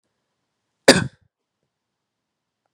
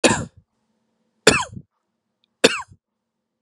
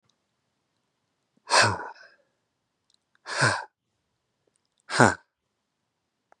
cough_length: 2.7 s
cough_amplitude: 32768
cough_signal_mean_std_ratio: 0.16
three_cough_length: 3.4 s
three_cough_amplitude: 32768
three_cough_signal_mean_std_ratio: 0.26
exhalation_length: 6.4 s
exhalation_amplitude: 27923
exhalation_signal_mean_std_ratio: 0.25
survey_phase: beta (2021-08-13 to 2022-03-07)
age: 18-44
gender: Male
wearing_mask: 'No'
symptom_shortness_of_breath: true
symptom_fatigue: true
symptom_onset: 12 days
smoker_status: Never smoked
respiratory_condition_asthma: true
respiratory_condition_other: false
recruitment_source: REACT
submission_delay: 2 days
covid_test_result: Negative
covid_test_method: RT-qPCR
influenza_a_test_result: Negative
influenza_b_test_result: Negative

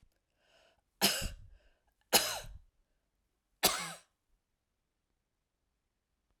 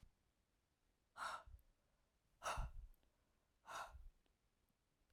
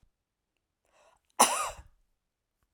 three_cough_length: 6.4 s
three_cough_amplitude: 9413
three_cough_signal_mean_std_ratio: 0.26
exhalation_length: 5.1 s
exhalation_amplitude: 702
exhalation_signal_mean_std_ratio: 0.39
cough_length: 2.7 s
cough_amplitude: 15710
cough_signal_mean_std_ratio: 0.22
survey_phase: alpha (2021-03-01 to 2021-08-12)
age: 45-64
gender: Female
wearing_mask: 'No'
symptom_none: true
smoker_status: Never smoked
respiratory_condition_asthma: false
respiratory_condition_other: false
recruitment_source: REACT
submission_delay: 1 day
covid_test_result: Negative
covid_test_method: RT-qPCR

